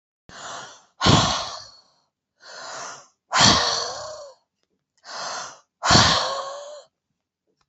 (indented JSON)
{
  "exhalation_length": "7.7 s",
  "exhalation_amplitude": 28812,
  "exhalation_signal_mean_std_ratio": 0.42,
  "survey_phase": "beta (2021-08-13 to 2022-03-07)",
  "age": "45-64",
  "gender": "Female",
  "wearing_mask": "No",
  "symptom_none": true,
  "smoker_status": "Never smoked",
  "respiratory_condition_asthma": false,
  "respiratory_condition_other": false,
  "recruitment_source": "REACT",
  "submission_delay": "2 days",
  "covid_test_result": "Negative",
  "covid_test_method": "RT-qPCR"
}